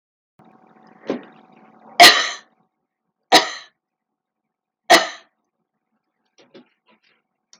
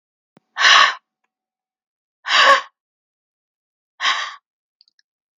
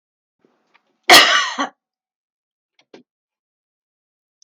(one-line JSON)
{"three_cough_length": "7.6 s", "three_cough_amplitude": 32768, "three_cough_signal_mean_std_ratio": 0.22, "exhalation_length": "5.4 s", "exhalation_amplitude": 32768, "exhalation_signal_mean_std_ratio": 0.31, "cough_length": "4.4 s", "cough_amplitude": 32768, "cough_signal_mean_std_ratio": 0.24, "survey_phase": "beta (2021-08-13 to 2022-03-07)", "age": "65+", "gender": "Female", "wearing_mask": "No", "symptom_none": true, "smoker_status": "Current smoker (1 to 10 cigarettes per day)", "respiratory_condition_asthma": false, "respiratory_condition_other": false, "recruitment_source": "REACT", "submission_delay": "1 day", "covid_test_result": "Negative", "covid_test_method": "RT-qPCR"}